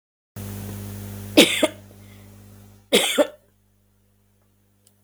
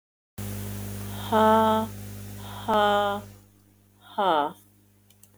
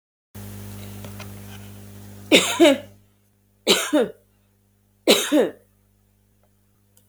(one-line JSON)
{"cough_length": "5.0 s", "cough_amplitude": 32768, "cough_signal_mean_std_ratio": 0.32, "exhalation_length": "5.4 s", "exhalation_amplitude": 14685, "exhalation_signal_mean_std_ratio": 0.51, "three_cough_length": "7.1 s", "three_cough_amplitude": 32161, "three_cough_signal_mean_std_ratio": 0.36, "survey_phase": "beta (2021-08-13 to 2022-03-07)", "age": "45-64", "gender": "Female", "wearing_mask": "No", "symptom_cough_any": true, "symptom_runny_or_blocked_nose": true, "symptom_sore_throat": true, "symptom_onset": "6 days", "smoker_status": "Never smoked", "respiratory_condition_asthma": true, "respiratory_condition_other": true, "recruitment_source": "REACT", "submission_delay": "1 day", "covid_test_result": "Negative", "covid_test_method": "RT-qPCR", "influenza_a_test_result": "Negative", "influenza_b_test_result": "Negative"}